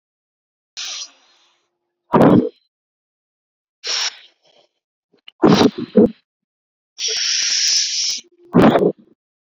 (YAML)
exhalation_length: 9.5 s
exhalation_amplitude: 32768
exhalation_signal_mean_std_ratio: 0.4
survey_phase: beta (2021-08-13 to 2022-03-07)
age: 18-44
gender: Female
wearing_mask: 'No'
symptom_none: true
smoker_status: Never smoked
respiratory_condition_asthma: false
respiratory_condition_other: false
recruitment_source: REACT
submission_delay: 4 days
covid_test_result: Negative
covid_test_method: RT-qPCR